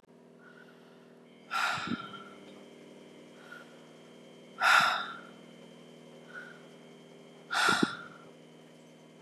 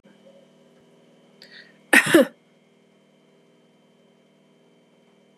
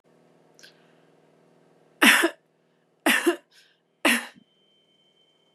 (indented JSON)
{
  "exhalation_length": "9.2 s",
  "exhalation_amplitude": 8674,
  "exhalation_signal_mean_std_ratio": 0.39,
  "cough_length": "5.4 s",
  "cough_amplitude": 29645,
  "cough_signal_mean_std_ratio": 0.2,
  "three_cough_length": "5.5 s",
  "three_cough_amplitude": 27419,
  "three_cough_signal_mean_std_ratio": 0.28,
  "survey_phase": "beta (2021-08-13 to 2022-03-07)",
  "age": "45-64",
  "gender": "Female",
  "wearing_mask": "No",
  "symptom_cough_any": true,
  "symptom_headache": true,
  "symptom_onset": "3 days",
  "smoker_status": "Never smoked",
  "respiratory_condition_asthma": false,
  "respiratory_condition_other": false,
  "recruitment_source": "Test and Trace",
  "submission_delay": "1 day",
  "covid_test_result": "Positive",
  "covid_test_method": "RT-qPCR",
  "covid_ct_value": 22.5,
  "covid_ct_gene": "N gene",
  "covid_ct_mean": 23.7,
  "covid_viral_load": "17000 copies/ml",
  "covid_viral_load_category": "Low viral load (10K-1M copies/ml)"
}